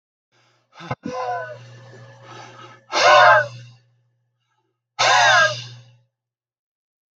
{
  "exhalation_length": "7.2 s",
  "exhalation_amplitude": 31914,
  "exhalation_signal_mean_std_ratio": 0.37,
  "survey_phase": "beta (2021-08-13 to 2022-03-07)",
  "age": "65+",
  "gender": "Male",
  "wearing_mask": "No",
  "symptom_cough_any": true,
  "smoker_status": "Ex-smoker",
  "respiratory_condition_asthma": false,
  "respiratory_condition_other": false,
  "recruitment_source": "REACT",
  "submission_delay": "5 days",
  "covid_test_result": "Negative",
  "covid_test_method": "RT-qPCR",
  "influenza_a_test_result": "Negative",
  "influenza_b_test_result": "Negative"
}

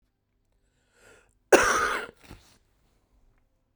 {
  "cough_length": "3.8 s",
  "cough_amplitude": 26373,
  "cough_signal_mean_std_ratio": 0.26,
  "survey_phase": "beta (2021-08-13 to 2022-03-07)",
  "age": "45-64",
  "gender": "Female",
  "wearing_mask": "No",
  "symptom_cough_any": true,
  "symptom_runny_or_blocked_nose": true,
  "symptom_change_to_sense_of_smell_or_taste": true,
  "smoker_status": "Never smoked",
  "respiratory_condition_asthma": true,
  "respiratory_condition_other": false,
  "recruitment_source": "Test and Trace",
  "submission_delay": "2 days",
  "covid_test_result": "Positive",
  "covid_test_method": "RT-qPCR",
  "covid_ct_value": 27.5,
  "covid_ct_gene": "ORF1ab gene",
  "covid_ct_mean": 28.1,
  "covid_viral_load": "590 copies/ml",
  "covid_viral_load_category": "Minimal viral load (< 10K copies/ml)"
}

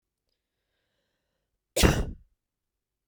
{
  "cough_length": "3.1 s",
  "cough_amplitude": 17947,
  "cough_signal_mean_std_ratio": 0.23,
  "survey_phase": "beta (2021-08-13 to 2022-03-07)",
  "age": "18-44",
  "gender": "Female",
  "wearing_mask": "No",
  "symptom_runny_or_blocked_nose": true,
  "symptom_headache": true,
  "symptom_other": true,
  "smoker_status": "Never smoked",
  "respiratory_condition_asthma": false,
  "respiratory_condition_other": false,
  "recruitment_source": "Test and Trace",
  "submission_delay": "2 days",
  "covid_test_result": "Positive",
  "covid_test_method": "RT-qPCR",
  "covid_ct_value": 22.2,
  "covid_ct_gene": "ORF1ab gene",
  "covid_ct_mean": 22.8,
  "covid_viral_load": "33000 copies/ml",
  "covid_viral_load_category": "Low viral load (10K-1M copies/ml)"
}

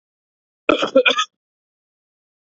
{
  "cough_length": "2.5 s",
  "cough_amplitude": 28267,
  "cough_signal_mean_std_ratio": 0.3,
  "survey_phase": "beta (2021-08-13 to 2022-03-07)",
  "age": "18-44",
  "gender": "Male",
  "wearing_mask": "No",
  "symptom_none": true,
  "smoker_status": "Never smoked",
  "respiratory_condition_asthma": false,
  "respiratory_condition_other": false,
  "recruitment_source": "REACT",
  "submission_delay": "1 day",
  "covid_test_result": "Negative",
  "covid_test_method": "RT-qPCR",
  "influenza_a_test_result": "Unknown/Void",
  "influenza_b_test_result": "Unknown/Void"
}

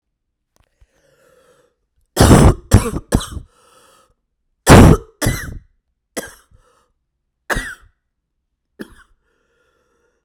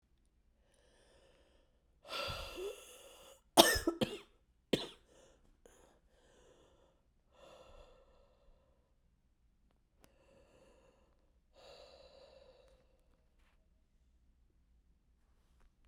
{
  "cough_length": "10.2 s",
  "cough_amplitude": 32768,
  "cough_signal_mean_std_ratio": 0.27,
  "exhalation_length": "15.9 s",
  "exhalation_amplitude": 18069,
  "exhalation_signal_mean_std_ratio": 0.19,
  "survey_phase": "beta (2021-08-13 to 2022-03-07)",
  "age": "18-44",
  "gender": "Female",
  "wearing_mask": "No",
  "symptom_cough_any": true,
  "symptom_runny_or_blocked_nose": true,
  "symptom_shortness_of_breath": true,
  "symptom_abdominal_pain": true,
  "symptom_fatigue": true,
  "symptom_headache": true,
  "symptom_loss_of_taste": true,
  "symptom_other": true,
  "smoker_status": "Current smoker (1 to 10 cigarettes per day)",
  "respiratory_condition_asthma": false,
  "respiratory_condition_other": false,
  "recruitment_source": "Test and Trace",
  "submission_delay": "2 days",
  "covid_test_result": "Positive",
  "covid_test_method": "ePCR"
}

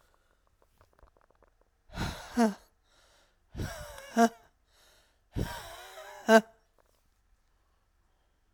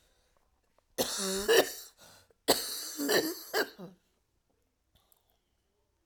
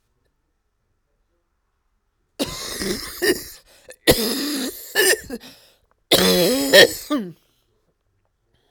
{
  "exhalation_length": "8.5 s",
  "exhalation_amplitude": 13978,
  "exhalation_signal_mean_std_ratio": 0.25,
  "three_cough_length": "6.1 s",
  "three_cough_amplitude": 11639,
  "three_cough_signal_mean_std_ratio": 0.38,
  "cough_length": "8.7 s",
  "cough_amplitude": 32768,
  "cough_signal_mean_std_ratio": 0.39,
  "survey_phase": "alpha (2021-03-01 to 2021-08-12)",
  "age": "45-64",
  "gender": "Female",
  "wearing_mask": "No",
  "symptom_diarrhoea": true,
  "symptom_fatigue": true,
  "symptom_fever_high_temperature": true,
  "symptom_headache": true,
  "smoker_status": "Ex-smoker",
  "respiratory_condition_asthma": true,
  "respiratory_condition_other": true,
  "recruitment_source": "Test and Trace",
  "submission_delay": "1 day",
  "covid_test_result": "Positive",
  "covid_test_method": "RT-qPCR",
  "covid_ct_value": 14.8,
  "covid_ct_gene": "ORF1ab gene",
  "covid_ct_mean": 15.0,
  "covid_viral_load": "12000000 copies/ml",
  "covid_viral_load_category": "High viral load (>1M copies/ml)"
}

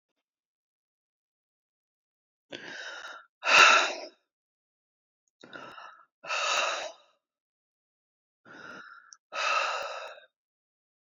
{
  "exhalation_length": "11.2 s",
  "exhalation_amplitude": 20079,
  "exhalation_signal_mean_std_ratio": 0.29,
  "survey_phase": "beta (2021-08-13 to 2022-03-07)",
  "age": "65+",
  "gender": "Female",
  "wearing_mask": "No",
  "symptom_runny_or_blocked_nose": true,
  "symptom_fatigue": true,
  "smoker_status": "Never smoked",
  "respiratory_condition_asthma": false,
  "respiratory_condition_other": false,
  "recruitment_source": "REACT",
  "submission_delay": "1 day",
  "covid_test_result": "Negative",
  "covid_test_method": "RT-qPCR"
}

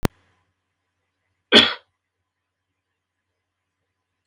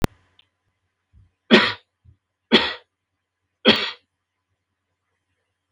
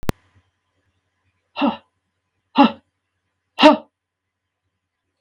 {
  "cough_length": "4.3 s",
  "cough_amplitude": 32768,
  "cough_signal_mean_std_ratio": 0.16,
  "three_cough_length": "5.7 s",
  "three_cough_amplitude": 32768,
  "three_cough_signal_mean_std_ratio": 0.24,
  "exhalation_length": "5.2 s",
  "exhalation_amplitude": 32691,
  "exhalation_signal_mean_std_ratio": 0.23,
  "survey_phase": "beta (2021-08-13 to 2022-03-07)",
  "age": "65+",
  "gender": "Male",
  "wearing_mask": "No",
  "symptom_none": true,
  "smoker_status": "Never smoked",
  "respiratory_condition_asthma": false,
  "respiratory_condition_other": false,
  "recruitment_source": "REACT",
  "submission_delay": "1 day",
  "covid_test_result": "Negative",
  "covid_test_method": "RT-qPCR",
  "influenza_a_test_result": "Negative",
  "influenza_b_test_result": "Negative"
}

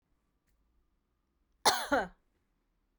{
  "cough_length": "3.0 s",
  "cough_amplitude": 10207,
  "cough_signal_mean_std_ratio": 0.25,
  "survey_phase": "beta (2021-08-13 to 2022-03-07)",
  "age": "45-64",
  "gender": "Female",
  "wearing_mask": "No",
  "symptom_runny_or_blocked_nose": true,
  "symptom_onset": "12 days",
  "smoker_status": "Never smoked",
  "respiratory_condition_asthma": false,
  "respiratory_condition_other": false,
  "recruitment_source": "REACT",
  "submission_delay": "3 days",
  "covid_test_result": "Negative",
  "covid_test_method": "RT-qPCR"
}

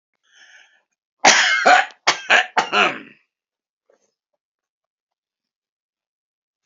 {
  "cough_length": "6.7 s",
  "cough_amplitude": 29774,
  "cough_signal_mean_std_ratio": 0.32,
  "survey_phase": "alpha (2021-03-01 to 2021-08-12)",
  "age": "65+",
  "gender": "Male",
  "wearing_mask": "No",
  "symptom_abdominal_pain": true,
  "symptom_onset": "12 days",
  "smoker_status": "Never smoked",
  "respiratory_condition_asthma": false,
  "respiratory_condition_other": false,
  "recruitment_source": "REACT",
  "submission_delay": "6 days",
  "covid_test_result": "Negative",
  "covid_test_method": "RT-qPCR"
}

